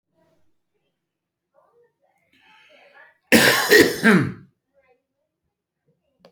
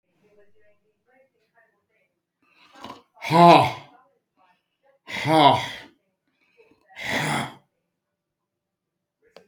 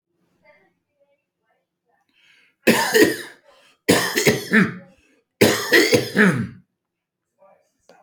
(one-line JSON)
{"cough_length": "6.3 s", "cough_amplitude": 29152, "cough_signal_mean_std_ratio": 0.29, "exhalation_length": "9.5 s", "exhalation_amplitude": 28395, "exhalation_signal_mean_std_ratio": 0.27, "three_cough_length": "8.0 s", "three_cough_amplitude": 28580, "three_cough_signal_mean_std_ratio": 0.4, "survey_phase": "beta (2021-08-13 to 2022-03-07)", "age": "45-64", "gender": "Male", "wearing_mask": "No", "symptom_none": true, "smoker_status": "Never smoked", "respiratory_condition_asthma": false, "respiratory_condition_other": false, "recruitment_source": "REACT", "submission_delay": "1 day", "covid_test_result": "Negative", "covid_test_method": "RT-qPCR"}